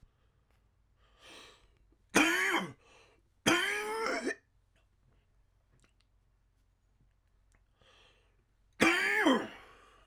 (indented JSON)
{
  "three_cough_length": "10.1 s",
  "three_cough_amplitude": 9902,
  "three_cough_signal_mean_std_ratio": 0.37,
  "survey_phase": "alpha (2021-03-01 to 2021-08-12)",
  "age": "18-44",
  "gender": "Male",
  "wearing_mask": "No",
  "symptom_cough_any": true,
  "symptom_new_continuous_cough": true,
  "symptom_onset": "2 days",
  "smoker_status": "Ex-smoker",
  "respiratory_condition_asthma": true,
  "respiratory_condition_other": false,
  "recruitment_source": "Test and Trace",
  "submission_delay": "2 days",
  "covid_test_result": "Positive",
  "covid_test_method": "RT-qPCR",
  "covid_ct_value": 19.7,
  "covid_ct_gene": "N gene",
  "covid_ct_mean": 20.3,
  "covid_viral_load": "230000 copies/ml",
  "covid_viral_load_category": "Low viral load (10K-1M copies/ml)"
}